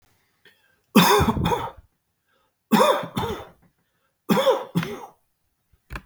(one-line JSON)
{"three_cough_length": "6.1 s", "three_cough_amplitude": 28442, "three_cough_signal_mean_std_ratio": 0.42, "survey_phase": "beta (2021-08-13 to 2022-03-07)", "age": "45-64", "gender": "Male", "wearing_mask": "No", "symptom_none": true, "symptom_onset": "9 days", "smoker_status": "Never smoked", "respiratory_condition_asthma": false, "respiratory_condition_other": false, "recruitment_source": "REACT", "submission_delay": "3 days", "covid_test_result": "Negative", "covid_test_method": "RT-qPCR", "influenza_a_test_result": "Negative", "influenza_b_test_result": "Negative"}